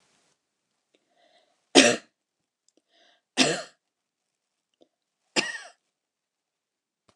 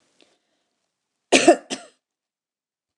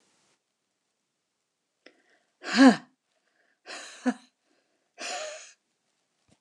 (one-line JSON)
{"three_cough_length": "7.2 s", "three_cough_amplitude": 28763, "three_cough_signal_mean_std_ratio": 0.19, "cough_length": "3.0 s", "cough_amplitude": 28851, "cough_signal_mean_std_ratio": 0.21, "exhalation_length": "6.4 s", "exhalation_amplitude": 20420, "exhalation_signal_mean_std_ratio": 0.2, "survey_phase": "beta (2021-08-13 to 2022-03-07)", "age": "65+", "gender": "Female", "wearing_mask": "No", "symptom_none": true, "smoker_status": "Never smoked", "respiratory_condition_asthma": false, "respiratory_condition_other": false, "recruitment_source": "REACT", "submission_delay": "2 days", "covid_test_result": "Negative", "covid_test_method": "RT-qPCR"}